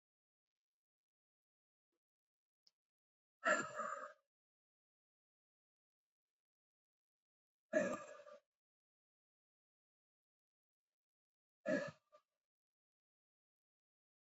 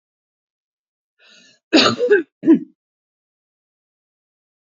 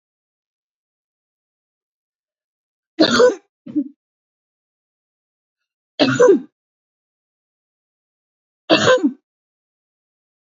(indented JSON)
{
  "exhalation_length": "14.3 s",
  "exhalation_amplitude": 2333,
  "exhalation_signal_mean_std_ratio": 0.2,
  "cough_length": "4.8 s",
  "cough_amplitude": 29552,
  "cough_signal_mean_std_ratio": 0.28,
  "three_cough_length": "10.4 s",
  "three_cough_amplitude": 29898,
  "three_cough_signal_mean_std_ratio": 0.27,
  "survey_phase": "beta (2021-08-13 to 2022-03-07)",
  "age": "65+",
  "gender": "Female",
  "wearing_mask": "No",
  "symptom_none": true,
  "symptom_onset": "12 days",
  "smoker_status": "Ex-smoker",
  "respiratory_condition_asthma": false,
  "respiratory_condition_other": false,
  "recruitment_source": "REACT",
  "submission_delay": "2 days",
  "covid_test_result": "Negative",
  "covid_test_method": "RT-qPCR",
  "influenza_a_test_result": "Negative",
  "influenza_b_test_result": "Negative"
}